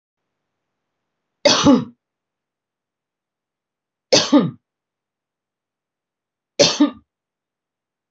{"three_cough_length": "8.1 s", "three_cough_amplitude": 32767, "three_cough_signal_mean_std_ratio": 0.26, "survey_phase": "beta (2021-08-13 to 2022-03-07)", "age": "45-64", "gender": "Female", "wearing_mask": "No", "symptom_none": true, "smoker_status": "Never smoked", "respiratory_condition_asthma": false, "respiratory_condition_other": false, "recruitment_source": "REACT", "submission_delay": "1 day", "covid_test_result": "Negative", "covid_test_method": "RT-qPCR", "influenza_a_test_result": "Negative", "influenza_b_test_result": "Negative"}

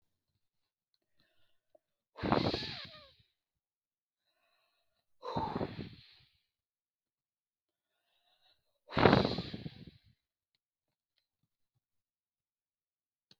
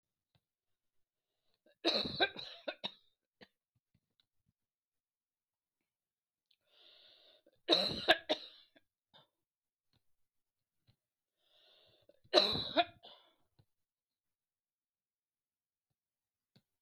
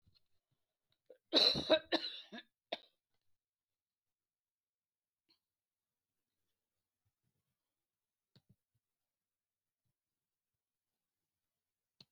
{"exhalation_length": "13.4 s", "exhalation_amplitude": 14278, "exhalation_signal_mean_std_ratio": 0.23, "three_cough_length": "16.8 s", "three_cough_amplitude": 8563, "three_cough_signal_mean_std_ratio": 0.21, "cough_length": "12.1 s", "cough_amplitude": 5465, "cough_signal_mean_std_ratio": 0.17, "survey_phase": "beta (2021-08-13 to 2022-03-07)", "age": "65+", "gender": "Female", "wearing_mask": "No", "symptom_runny_or_blocked_nose": true, "symptom_shortness_of_breath": true, "smoker_status": "Never smoked", "respiratory_condition_asthma": false, "respiratory_condition_other": false, "recruitment_source": "REACT", "submission_delay": "2 days", "covid_test_result": "Negative", "covid_test_method": "RT-qPCR", "influenza_a_test_result": "Negative", "influenza_b_test_result": "Negative"}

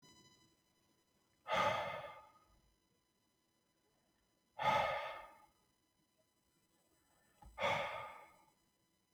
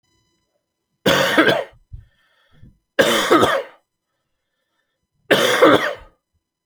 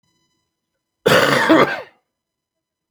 {"exhalation_length": "9.1 s", "exhalation_amplitude": 2505, "exhalation_signal_mean_std_ratio": 0.35, "three_cough_length": "6.7 s", "three_cough_amplitude": 32542, "three_cough_signal_mean_std_ratio": 0.42, "cough_length": "2.9 s", "cough_amplitude": 29698, "cough_signal_mean_std_ratio": 0.4, "survey_phase": "beta (2021-08-13 to 2022-03-07)", "age": "18-44", "gender": "Male", "wearing_mask": "No", "symptom_cough_any": true, "symptom_runny_or_blocked_nose": true, "symptom_diarrhoea": true, "symptom_fatigue": true, "symptom_fever_high_temperature": true, "symptom_change_to_sense_of_smell_or_taste": true, "symptom_loss_of_taste": true, "symptom_onset": "3 days", "smoker_status": "Never smoked", "respiratory_condition_asthma": false, "respiratory_condition_other": false, "recruitment_source": "Test and Trace", "submission_delay": "2 days", "covid_test_result": "Positive", "covid_test_method": "RT-qPCR", "covid_ct_value": 16.3, "covid_ct_gene": "ORF1ab gene", "covid_ct_mean": 17.3, "covid_viral_load": "2200000 copies/ml", "covid_viral_load_category": "High viral load (>1M copies/ml)"}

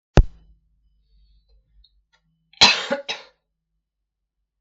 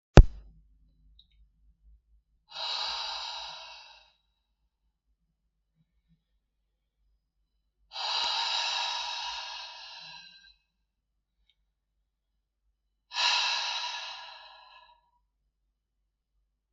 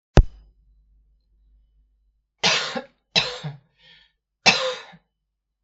{"cough_length": "4.6 s", "cough_amplitude": 32766, "cough_signal_mean_std_ratio": 0.21, "exhalation_length": "16.7 s", "exhalation_amplitude": 32766, "exhalation_signal_mean_std_ratio": 0.23, "three_cough_length": "5.6 s", "three_cough_amplitude": 32766, "three_cough_signal_mean_std_ratio": 0.27, "survey_phase": "beta (2021-08-13 to 2022-03-07)", "age": "45-64", "gender": "Female", "wearing_mask": "No", "symptom_runny_or_blocked_nose": true, "symptom_sore_throat": true, "symptom_onset": "7 days", "smoker_status": "Never smoked", "respiratory_condition_asthma": false, "respiratory_condition_other": false, "recruitment_source": "REACT", "submission_delay": "1 day", "covid_test_result": "Negative", "covid_test_method": "RT-qPCR", "influenza_a_test_result": "Negative", "influenza_b_test_result": "Negative"}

